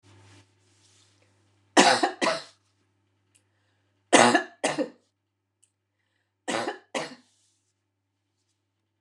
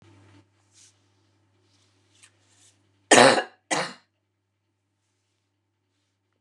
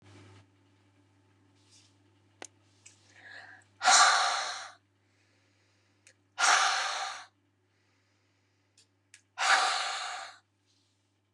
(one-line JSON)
{"three_cough_length": "9.0 s", "three_cough_amplitude": 29004, "three_cough_signal_mean_std_ratio": 0.27, "cough_length": "6.4 s", "cough_amplitude": 29203, "cough_signal_mean_std_ratio": 0.19, "exhalation_length": "11.3 s", "exhalation_amplitude": 13101, "exhalation_signal_mean_std_ratio": 0.34, "survey_phase": "beta (2021-08-13 to 2022-03-07)", "age": "65+", "gender": "Female", "wearing_mask": "No", "symptom_headache": true, "smoker_status": "Ex-smoker", "respiratory_condition_asthma": false, "respiratory_condition_other": false, "recruitment_source": "REACT", "submission_delay": "4 days", "covid_test_result": "Negative", "covid_test_method": "RT-qPCR", "influenza_a_test_result": "Negative", "influenza_b_test_result": "Negative"}